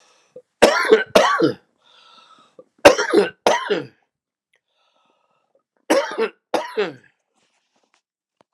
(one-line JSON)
{"three_cough_length": "8.5 s", "three_cough_amplitude": 32768, "three_cough_signal_mean_std_ratio": 0.35, "survey_phase": "alpha (2021-03-01 to 2021-08-12)", "age": "45-64", "gender": "Male", "wearing_mask": "No", "symptom_shortness_of_breath": true, "symptom_fever_high_temperature": true, "symptom_onset": "3 days", "smoker_status": "Never smoked", "respiratory_condition_asthma": true, "respiratory_condition_other": true, "recruitment_source": "Test and Trace", "submission_delay": "2 days", "covid_test_result": "Positive", "covid_test_method": "RT-qPCR"}